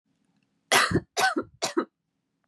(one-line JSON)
{"three_cough_length": "2.5 s", "three_cough_amplitude": 18578, "three_cough_signal_mean_std_ratio": 0.41, "survey_phase": "beta (2021-08-13 to 2022-03-07)", "age": "18-44", "gender": "Female", "wearing_mask": "No", "symptom_none": true, "smoker_status": "Prefer not to say", "respiratory_condition_asthma": false, "respiratory_condition_other": false, "recruitment_source": "REACT", "submission_delay": "3 days", "covid_test_result": "Negative", "covid_test_method": "RT-qPCR", "influenza_a_test_result": "Negative", "influenza_b_test_result": "Negative"}